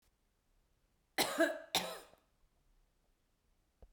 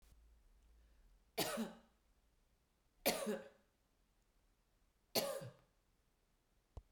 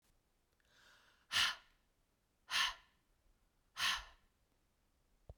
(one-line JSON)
{"cough_length": "3.9 s", "cough_amplitude": 4116, "cough_signal_mean_std_ratio": 0.29, "three_cough_length": "6.9 s", "three_cough_amplitude": 3505, "three_cough_signal_mean_std_ratio": 0.32, "exhalation_length": "5.4 s", "exhalation_amplitude": 3050, "exhalation_signal_mean_std_ratio": 0.3, "survey_phase": "beta (2021-08-13 to 2022-03-07)", "age": "45-64", "gender": "Female", "wearing_mask": "No", "symptom_none": true, "smoker_status": "Never smoked", "respiratory_condition_asthma": false, "respiratory_condition_other": false, "recruitment_source": "REACT", "submission_delay": "2 days", "covid_test_result": "Negative", "covid_test_method": "RT-qPCR"}